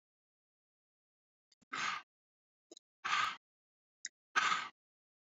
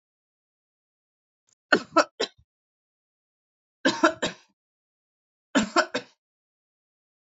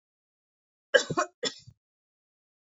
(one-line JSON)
{"exhalation_length": "5.3 s", "exhalation_amplitude": 4646, "exhalation_signal_mean_std_ratio": 0.31, "three_cough_length": "7.3 s", "three_cough_amplitude": 24067, "three_cough_signal_mean_std_ratio": 0.23, "cough_length": "2.7 s", "cough_amplitude": 17356, "cough_signal_mean_std_ratio": 0.22, "survey_phase": "beta (2021-08-13 to 2022-03-07)", "age": "18-44", "gender": "Female", "wearing_mask": "No", "symptom_none": true, "smoker_status": "Never smoked", "respiratory_condition_asthma": false, "respiratory_condition_other": false, "recruitment_source": "REACT", "submission_delay": "1 day", "covid_test_result": "Negative", "covid_test_method": "RT-qPCR", "influenza_a_test_result": "Negative", "influenza_b_test_result": "Negative"}